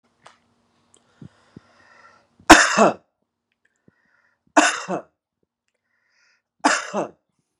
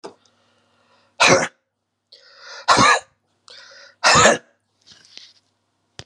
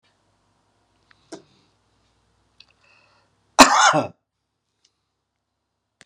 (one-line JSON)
{"three_cough_length": "7.6 s", "three_cough_amplitude": 32768, "three_cough_signal_mean_std_ratio": 0.24, "exhalation_length": "6.1 s", "exhalation_amplitude": 32619, "exhalation_signal_mean_std_ratio": 0.33, "cough_length": "6.1 s", "cough_amplitude": 32768, "cough_signal_mean_std_ratio": 0.2, "survey_phase": "beta (2021-08-13 to 2022-03-07)", "age": "65+", "gender": "Male", "wearing_mask": "No", "symptom_cough_any": true, "symptom_runny_or_blocked_nose": true, "symptom_change_to_sense_of_smell_or_taste": true, "symptom_loss_of_taste": true, "symptom_onset": "6 days", "smoker_status": "Ex-smoker", "respiratory_condition_asthma": false, "respiratory_condition_other": false, "recruitment_source": "Test and Trace", "submission_delay": "2 days", "covid_test_result": "Positive", "covid_test_method": "RT-qPCR", "covid_ct_value": 18.7, "covid_ct_gene": "ORF1ab gene"}